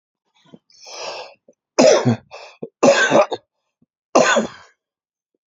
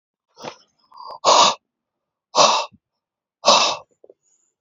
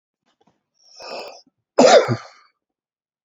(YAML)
three_cough_length: 5.5 s
three_cough_amplitude: 32767
three_cough_signal_mean_std_ratio: 0.39
exhalation_length: 4.6 s
exhalation_amplitude: 31823
exhalation_signal_mean_std_ratio: 0.36
cough_length: 3.2 s
cough_amplitude: 29486
cough_signal_mean_std_ratio: 0.28
survey_phase: beta (2021-08-13 to 2022-03-07)
age: 65+
gender: Male
wearing_mask: 'No'
symptom_cough_any: true
symptom_runny_or_blocked_nose: true
symptom_sore_throat: true
symptom_onset: 3 days
smoker_status: Never smoked
respiratory_condition_asthma: false
respiratory_condition_other: false
recruitment_source: Test and Trace
submission_delay: 2 days
covid_test_result: Positive
covid_test_method: RT-qPCR
covid_ct_value: 25.2
covid_ct_gene: N gene